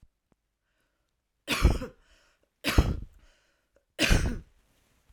{"three_cough_length": "5.1 s", "three_cough_amplitude": 16179, "three_cough_signal_mean_std_ratio": 0.33, "survey_phase": "alpha (2021-03-01 to 2021-08-12)", "age": "18-44", "gender": "Female", "wearing_mask": "No", "symptom_cough_any": true, "symptom_fatigue": true, "symptom_headache": true, "symptom_change_to_sense_of_smell_or_taste": true, "smoker_status": "Never smoked", "respiratory_condition_asthma": false, "respiratory_condition_other": false, "recruitment_source": "Test and Trace", "submission_delay": "2 days", "covid_test_result": "Positive", "covid_test_method": "RT-qPCR", "covid_ct_value": 15.4, "covid_ct_gene": "ORF1ab gene", "covid_ct_mean": 15.9, "covid_viral_load": "6200000 copies/ml", "covid_viral_load_category": "High viral load (>1M copies/ml)"}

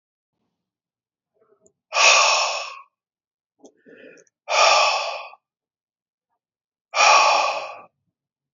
{"exhalation_length": "8.5 s", "exhalation_amplitude": 27699, "exhalation_signal_mean_std_ratio": 0.39, "survey_phase": "alpha (2021-03-01 to 2021-08-12)", "age": "45-64", "gender": "Male", "wearing_mask": "No", "symptom_fatigue": true, "symptom_headache": true, "symptom_change_to_sense_of_smell_or_taste": true, "smoker_status": "Ex-smoker", "respiratory_condition_asthma": false, "respiratory_condition_other": false, "recruitment_source": "Test and Trace", "submission_delay": "2 days", "covid_test_result": "Positive", "covid_test_method": "RT-qPCR", "covid_ct_value": 16.1, "covid_ct_gene": "ORF1ab gene", "covid_ct_mean": 16.5, "covid_viral_load": "3700000 copies/ml", "covid_viral_load_category": "High viral load (>1M copies/ml)"}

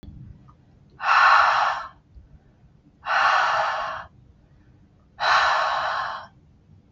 {"exhalation_length": "6.9 s", "exhalation_amplitude": 19107, "exhalation_signal_mean_std_ratio": 0.54, "survey_phase": "beta (2021-08-13 to 2022-03-07)", "age": "45-64", "gender": "Female", "wearing_mask": "No", "symptom_headache": true, "symptom_other": true, "smoker_status": "Ex-smoker", "respiratory_condition_asthma": false, "respiratory_condition_other": false, "recruitment_source": "REACT", "submission_delay": "2 days", "covid_test_result": "Negative", "covid_test_method": "RT-qPCR", "influenza_a_test_result": "Negative", "influenza_b_test_result": "Negative"}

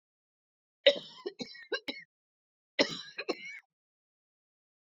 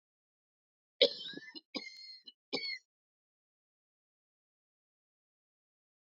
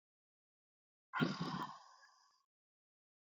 {"cough_length": "4.9 s", "cough_amplitude": 15446, "cough_signal_mean_std_ratio": 0.24, "three_cough_length": "6.1 s", "three_cough_amplitude": 8584, "three_cough_signal_mean_std_ratio": 0.2, "exhalation_length": "3.3 s", "exhalation_amplitude": 2558, "exhalation_signal_mean_std_ratio": 0.31, "survey_phase": "alpha (2021-03-01 to 2021-08-12)", "age": "45-64", "gender": "Female", "wearing_mask": "No", "symptom_cough_any": true, "symptom_new_continuous_cough": true, "symptom_shortness_of_breath": true, "symptom_abdominal_pain": true, "symptom_fatigue": true, "symptom_fever_high_temperature": true, "symptom_headache": true, "symptom_change_to_sense_of_smell_or_taste": true, "symptom_loss_of_taste": true, "symptom_onset": "2 days", "smoker_status": "Never smoked", "respiratory_condition_asthma": false, "respiratory_condition_other": false, "recruitment_source": "Test and Trace", "submission_delay": "2 days", "covid_test_result": "Positive", "covid_test_method": "RT-qPCR", "covid_ct_value": 15.8, "covid_ct_gene": "ORF1ab gene", "covid_ct_mean": 16.0, "covid_viral_load": "5700000 copies/ml", "covid_viral_load_category": "High viral load (>1M copies/ml)"}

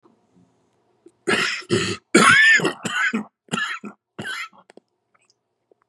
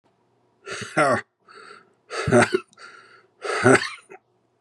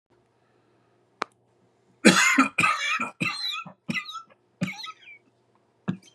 {"cough_length": "5.9 s", "cough_amplitude": 31796, "cough_signal_mean_std_ratio": 0.43, "exhalation_length": "4.6 s", "exhalation_amplitude": 28861, "exhalation_signal_mean_std_ratio": 0.38, "three_cough_length": "6.1 s", "three_cough_amplitude": 28059, "three_cough_signal_mean_std_ratio": 0.38, "survey_phase": "beta (2021-08-13 to 2022-03-07)", "age": "45-64", "gender": "Male", "wearing_mask": "No", "symptom_cough_any": true, "symptom_shortness_of_breath": true, "symptom_sore_throat": true, "symptom_headache": true, "smoker_status": "Ex-smoker", "respiratory_condition_asthma": false, "respiratory_condition_other": false, "recruitment_source": "Test and Trace", "submission_delay": "2 days", "covid_test_result": "Positive", "covid_test_method": "LFT"}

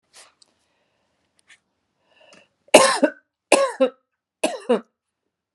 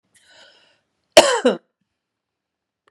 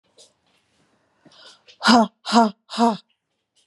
{"three_cough_length": "5.5 s", "three_cough_amplitude": 32768, "three_cough_signal_mean_std_ratio": 0.27, "cough_length": "2.9 s", "cough_amplitude": 32768, "cough_signal_mean_std_ratio": 0.23, "exhalation_length": "3.7 s", "exhalation_amplitude": 28212, "exhalation_signal_mean_std_ratio": 0.32, "survey_phase": "beta (2021-08-13 to 2022-03-07)", "age": "45-64", "gender": "Female", "wearing_mask": "No", "symptom_none": true, "smoker_status": "Never smoked", "respiratory_condition_asthma": false, "respiratory_condition_other": false, "recruitment_source": "REACT", "submission_delay": "2 days", "covid_test_result": "Negative", "covid_test_method": "RT-qPCR"}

